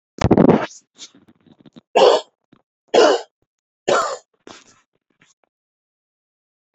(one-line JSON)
{"three_cough_length": "6.7 s", "three_cough_amplitude": 32767, "three_cough_signal_mean_std_ratio": 0.32, "survey_phase": "beta (2021-08-13 to 2022-03-07)", "age": "65+", "gender": "Male", "wearing_mask": "No", "symptom_none": true, "smoker_status": "Ex-smoker", "respiratory_condition_asthma": false, "respiratory_condition_other": false, "recruitment_source": "REACT", "submission_delay": "1 day", "covid_test_result": "Negative", "covid_test_method": "RT-qPCR"}